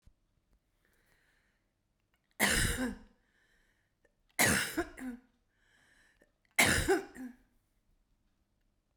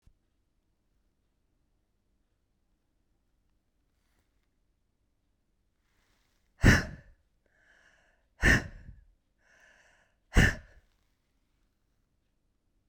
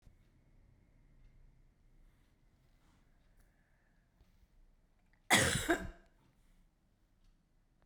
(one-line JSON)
{"three_cough_length": "9.0 s", "three_cough_amplitude": 9307, "three_cough_signal_mean_std_ratio": 0.33, "exhalation_length": "12.9 s", "exhalation_amplitude": 12725, "exhalation_signal_mean_std_ratio": 0.18, "cough_length": "7.9 s", "cough_amplitude": 6369, "cough_signal_mean_std_ratio": 0.23, "survey_phase": "beta (2021-08-13 to 2022-03-07)", "age": "65+", "gender": "Female", "wearing_mask": "No", "symptom_cough_any": true, "symptom_change_to_sense_of_smell_or_taste": true, "symptom_loss_of_taste": true, "symptom_onset": "9 days", "smoker_status": "Ex-smoker", "respiratory_condition_asthma": true, "respiratory_condition_other": false, "recruitment_source": "Test and Trace", "submission_delay": "1 day", "covid_test_result": "Positive", "covid_test_method": "RT-qPCR", "covid_ct_value": 17.7, "covid_ct_gene": "ORF1ab gene", "covid_ct_mean": 18.3, "covid_viral_load": "990000 copies/ml", "covid_viral_load_category": "Low viral load (10K-1M copies/ml)"}